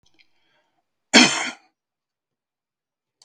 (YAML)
cough_length: 3.2 s
cough_amplitude: 32768
cough_signal_mean_std_ratio: 0.22
survey_phase: beta (2021-08-13 to 2022-03-07)
age: 65+
gender: Male
wearing_mask: 'No'
symptom_none: true
symptom_onset: 6 days
smoker_status: Never smoked
respiratory_condition_asthma: true
respiratory_condition_other: false
recruitment_source: REACT
submission_delay: 3 days
covid_test_result: Negative
covid_test_method: RT-qPCR
influenza_a_test_result: Unknown/Void
influenza_b_test_result: Unknown/Void